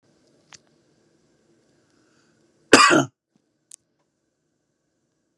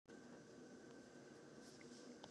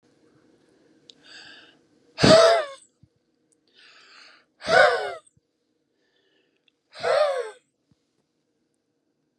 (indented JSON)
{
  "cough_length": "5.4 s",
  "cough_amplitude": 32768,
  "cough_signal_mean_std_ratio": 0.19,
  "three_cough_length": "2.3 s",
  "three_cough_amplitude": 499,
  "three_cough_signal_mean_std_ratio": 1.2,
  "exhalation_length": "9.4 s",
  "exhalation_amplitude": 25985,
  "exhalation_signal_mean_std_ratio": 0.29,
  "survey_phase": "beta (2021-08-13 to 2022-03-07)",
  "age": "45-64",
  "gender": "Male",
  "wearing_mask": "No",
  "symptom_none": true,
  "smoker_status": "Ex-smoker",
  "respiratory_condition_asthma": false,
  "respiratory_condition_other": false,
  "recruitment_source": "REACT",
  "submission_delay": "4 days",
  "covid_test_result": "Negative",
  "covid_test_method": "RT-qPCR",
  "influenza_a_test_result": "Negative",
  "influenza_b_test_result": "Negative"
}